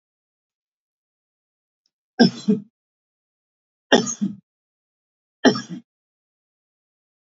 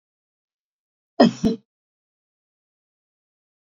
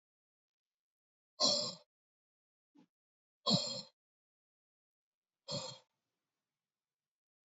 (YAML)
three_cough_length: 7.3 s
three_cough_amplitude: 28866
three_cough_signal_mean_std_ratio: 0.22
cough_length: 3.7 s
cough_amplitude: 31524
cough_signal_mean_std_ratio: 0.19
exhalation_length: 7.6 s
exhalation_amplitude: 4594
exhalation_signal_mean_std_ratio: 0.24
survey_phase: beta (2021-08-13 to 2022-03-07)
age: 45-64
gender: Male
wearing_mask: 'No'
symptom_none: true
smoker_status: Never smoked
respiratory_condition_asthma: false
respiratory_condition_other: false
recruitment_source: REACT
submission_delay: 1 day
covid_test_result: Negative
covid_test_method: RT-qPCR
influenza_a_test_result: Negative
influenza_b_test_result: Negative